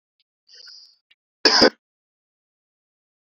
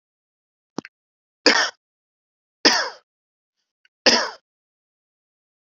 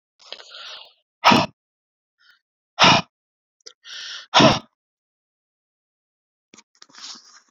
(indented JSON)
{
  "cough_length": "3.2 s",
  "cough_amplitude": 32767,
  "cough_signal_mean_std_ratio": 0.21,
  "three_cough_length": "5.6 s",
  "three_cough_amplitude": 32768,
  "three_cough_signal_mean_std_ratio": 0.25,
  "exhalation_length": "7.5 s",
  "exhalation_amplitude": 32701,
  "exhalation_signal_mean_std_ratio": 0.25,
  "survey_phase": "beta (2021-08-13 to 2022-03-07)",
  "age": "18-44",
  "gender": "Male",
  "wearing_mask": "No",
  "symptom_cough_any": true,
  "symptom_runny_or_blocked_nose": true,
  "symptom_sore_throat": true,
  "symptom_headache": true,
  "symptom_onset": "3 days",
  "smoker_status": "Never smoked",
  "respiratory_condition_asthma": false,
  "respiratory_condition_other": false,
  "recruitment_source": "Test and Trace",
  "submission_delay": "1 day",
  "covid_test_result": "Positive",
  "covid_test_method": "ePCR"
}